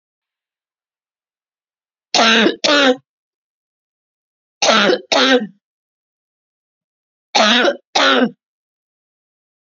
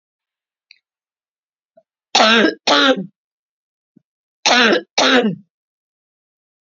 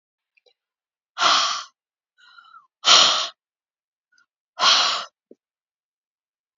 three_cough_length: 9.6 s
three_cough_amplitude: 32768
three_cough_signal_mean_std_ratio: 0.38
cough_length: 6.7 s
cough_amplitude: 32767
cough_signal_mean_std_ratio: 0.37
exhalation_length: 6.6 s
exhalation_amplitude: 28298
exhalation_signal_mean_std_ratio: 0.33
survey_phase: beta (2021-08-13 to 2022-03-07)
age: 65+
gender: Female
wearing_mask: 'No'
symptom_cough_any: true
symptom_onset: 8 days
smoker_status: Never smoked
respiratory_condition_asthma: false
respiratory_condition_other: false
recruitment_source: REACT
submission_delay: 1 day
covid_test_result: Positive
covid_test_method: RT-qPCR
covid_ct_value: 25.0
covid_ct_gene: E gene
influenza_a_test_result: Negative
influenza_b_test_result: Negative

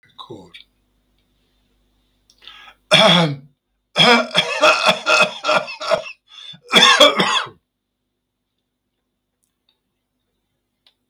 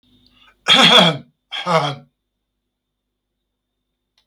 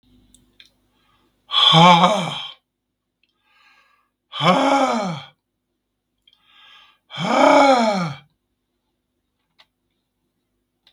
three_cough_length: 11.1 s
three_cough_amplitude: 32768
three_cough_signal_mean_std_ratio: 0.39
cough_length: 4.3 s
cough_amplitude: 32768
cough_signal_mean_std_ratio: 0.33
exhalation_length: 10.9 s
exhalation_amplitude: 32766
exhalation_signal_mean_std_ratio: 0.38
survey_phase: beta (2021-08-13 to 2022-03-07)
age: 65+
gender: Male
wearing_mask: 'No'
symptom_cough_any: true
symptom_runny_or_blocked_nose: true
symptom_onset: 6 days
smoker_status: Ex-smoker
respiratory_condition_asthma: false
respiratory_condition_other: false
recruitment_source: REACT
submission_delay: 1 day
covid_test_result: Negative
covid_test_method: RT-qPCR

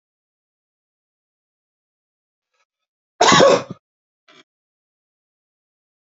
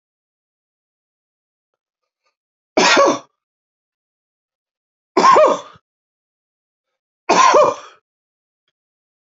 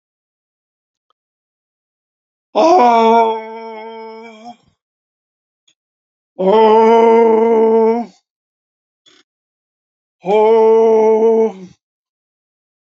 cough_length: 6.1 s
cough_amplitude: 28188
cough_signal_mean_std_ratio: 0.21
three_cough_length: 9.2 s
three_cough_amplitude: 30302
three_cough_signal_mean_std_ratio: 0.3
exhalation_length: 12.9 s
exhalation_amplitude: 29284
exhalation_signal_mean_std_ratio: 0.49
survey_phase: alpha (2021-03-01 to 2021-08-12)
age: 65+
gender: Male
wearing_mask: 'No'
symptom_none: true
smoker_status: Never smoked
respiratory_condition_asthma: false
respiratory_condition_other: false
recruitment_source: REACT
submission_delay: 2 days
covid_test_result: Negative
covid_test_method: RT-qPCR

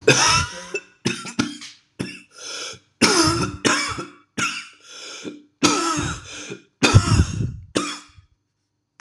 three_cough_length: 9.0 s
three_cough_amplitude: 26028
three_cough_signal_mean_std_ratio: 0.5
survey_phase: beta (2021-08-13 to 2022-03-07)
age: 45-64
gender: Male
wearing_mask: 'No'
symptom_cough_any: true
symptom_new_continuous_cough: true
symptom_runny_or_blocked_nose: true
symptom_shortness_of_breath: true
symptom_sore_throat: true
symptom_fatigue: true
symptom_headache: true
symptom_onset: 3 days
smoker_status: Ex-smoker
respiratory_condition_asthma: false
respiratory_condition_other: false
recruitment_source: Test and Trace
submission_delay: 1 day
covid_test_result: Positive
covid_test_method: RT-qPCR
covid_ct_value: 17.1
covid_ct_gene: N gene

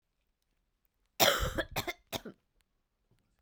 cough_length: 3.4 s
cough_amplitude: 8968
cough_signal_mean_std_ratio: 0.3
survey_phase: beta (2021-08-13 to 2022-03-07)
age: 18-44
gender: Female
wearing_mask: 'No'
symptom_cough_any: true
symptom_new_continuous_cough: true
symptom_sore_throat: true
symptom_abdominal_pain: true
symptom_diarrhoea: true
symptom_headache: true
symptom_change_to_sense_of_smell_or_taste: true
symptom_loss_of_taste: true
symptom_onset: 6 days
smoker_status: Ex-smoker
respiratory_condition_asthma: false
respiratory_condition_other: false
recruitment_source: Test and Trace
submission_delay: 3 days
covid_test_result: Positive
covid_test_method: ePCR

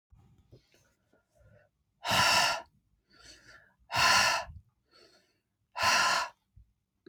exhalation_length: 7.1 s
exhalation_amplitude: 8226
exhalation_signal_mean_std_ratio: 0.4
survey_phase: beta (2021-08-13 to 2022-03-07)
age: 45-64
gender: Female
wearing_mask: 'No'
symptom_none: true
smoker_status: Ex-smoker
respiratory_condition_asthma: false
respiratory_condition_other: false
recruitment_source: REACT
submission_delay: 6 days
covid_test_result: Negative
covid_test_method: RT-qPCR
influenza_a_test_result: Negative
influenza_b_test_result: Negative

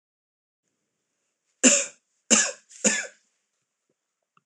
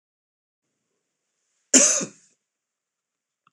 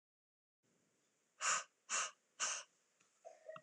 three_cough_length: 4.5 s
three_cough_amplitude: 24080
three_cough_signal_mean_std_ratio: 0.27
cough_length: 3.5 s
cough_amplitude: 26027
cough_signal_mean_std_ratio: 0.22
exhalation_length: 3.6 s
exhalation_amplitude: 1959
exhalation_signal_mean_std_ratio: 0.36
survey_phase: beta (2021-08-13 to 2022-03-07)
age: 45-64
gender: Male
wearing_mask: 'No'
symptom_cough_any: true
symptom_runny_or_blocked_nose: true
symptom_sore_throat: true
symptom_fatigue: true
smoker_status: Never smoked
respiratory_condition_asthma: false
respiratory_condition_other: false
recruitment_source: Test and Trace
submission_delay: 2 days
covid_test_result: Positive
covid_test_method: RT-qPCR
covid_ct_value: 23.1
covid_ct_gene: ORF1ab gene
covid_ct_mean: 23.5
covid_viral_load: 20000 copies/ml
covid_viral_load_category: Low viral load (10K-1M copies/ml)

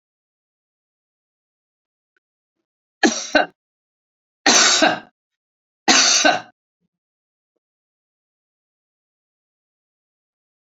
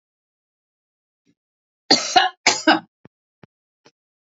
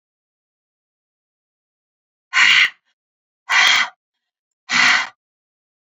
three_cough_length: 10.7 s
three_cough_amplitude: 32768
three_cough_signal_mean_std_ratio: 0.27
cough_length: 4.3 s
cough_amplitude: 30197
cough_signal_mean_std_ratio: 0.26
exhalation_length: 5.9 s
exhalation_amplitude: 29438
exhalation_signal_mean_std_ratio: 0.35
survey_phase: beta (2021-08-13 to 2022-03-07)
age: 65+
gender: Female
wearing_mask: 'No'
symptom_none: true
smoker_status: Never smoked
respiratory_condition_asthma: false
respiratory_condition_other: false
recruitment_source: REACT
submission_delay: 2 days
covid_test_result: Negative
covid_test_method: RT-qPCR
influenza_a_test_result: Negative
influenza_b_test_result: Negative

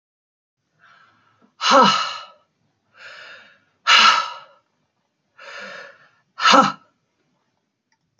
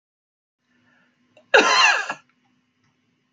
exhalation_length: 8.2 s
exhalation_amplitude: 29400
exhalation_signal_mean_std_ratio: 0.32
cough_length: 3.3 s
cough_amplitude: 28605
cough_signal_mean_std_ratio: 0.31
survey_phase: beta (2021-08-13 to 2022-03-07)
age: 45-64
gender: Female
wearing_mask: 'No'
symptom_none: true
smoker_status: Current smoker (1 to 10 cigarettes per day)
respiratory_condition_asthma: false
respiratory_condition_other: false
recruitment_source: REACT
submission_delay: 2 days
covid_test_result: Negative
covid_test_method: RT-qPCR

